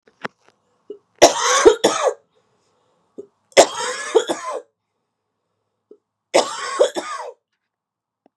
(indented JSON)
{
  "three_cough_length": "8.4 s",
  "three_cough_amplitude": 32768,
  "three_cough_signal_mean_std_ratio": 0.33,
  "survey_phase": "beta (2021-08-13 to 2022-03-07)",
  "age": "45-64",
  "gender": "Female",
  "wearing_mask": "No",
  "symptom_cough_any": true,
  "symptom_new_continuous_cough": true,
  "symptom_runny_or_blocked_nose": true,
  "symptom_shortness_of_breath": true,
  "symptom_fatigue": true,
  "symptom_fever_high_temperature": true,
  "symptom_headache": true,
  "symptom_change_to_sense_of_smell_or_taste": true,
  "symptom_onset": "6 days",
  "smoker_status": "Never smoked",
  "respiratory_condition_asthma": false,
  "respiratory_condition_other": true,
  "recruitment_source": "Test and Trace",
  "submission_delay": "2 days",
  "covid_test_result": "Positive",
  "covid_test_method": "RT-qPCR",
  "covid_ct_value": 11.1,
  "covid_ct_gene": "ORF1ab gene",
  "covid_ct_mean": 11.6,
  "covid_viral_load": "160000000 copies/ml",
  "covid_viral_load_category": "High viral load (>1M copies/ml)"
}